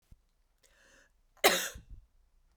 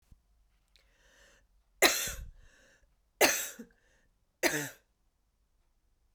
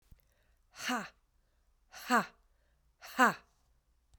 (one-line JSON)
{"cough_length": "2.6 s", "cough_amplitude": 11214, "cough_signal_mean_std_ratio": 0.24, "three_cough_length": "6.1 s", "three_cough_amplitude": 12277, "three_cough_signal_mean_std_ratio": 0.27, "exhalation_length": "4.2 s", "exhalation_amplitude": 7194, "exhalation_signal_mean_std_ratio": 0.27, "survey_phase": "beta (2021-08-13 to 2022-03-07)", "age": "45-64", "gender": "Female", "wearing_mask": "No", "symptom_cough_any": true, "symptom_runny_or_blocked_nose": true, "symptom_sore_throat": true, "symptom_fatigue": true, "symptom_headache": true, "symptom_onset": "2 days", "smoker_status": "Never smoked", "respiratory_condition_asthma": false, "respiratory_condition_other": false, "recruitment_source": "Test and Trace", "submission_delay": "1 day", "covid_test_result": "Positive", "covid_test_method": "RT-qPCR", "covid_ct_value": 24.9, "covid_ct_gene": "ORF1ab gene", "covid_ct_mean": 25.4, "covid_viral_load": "4600 copies/ml", "covid_viral_load_category": "Minimal viral load (< 10K copies/ml)"}